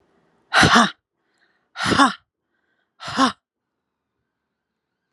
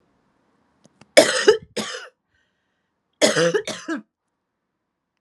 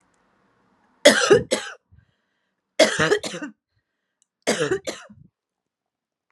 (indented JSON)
{
  "exhalation_length": "5.1 s",
  "exhalation_amplitude": 32383,
  "exhalation_signal_mean_std_ratio": 0.31,
  "cough_length": "5.2 s",
  "cough_amplitude": 32768,
  "cough_signal_mean_std_ratio": 0.31,
  "three_cough_length": "6.3 s",
  "three_cough_amplitude": 32389,
  "three_cough_signal_mean_std_ratio": 0.32,
  "survey_phase": "alpha (2021-03-01 to 2021-08-12)",
  "age": "18-44",
  "gender": "Female",
  "wearing_mask": "No",
  "symptom_none": true,
  "smoker_status": "Current smoker (1 to 10 cigarettes per day)",
  "respiratory_condition_asthma": false,
  "respiratory_condition_other": false,
  "recruitment_source": "REACT",
  "submission_delay": "2 days",
  "covid_test_result": "Negative",
  "covid_test_method": "RT-qPCR"
}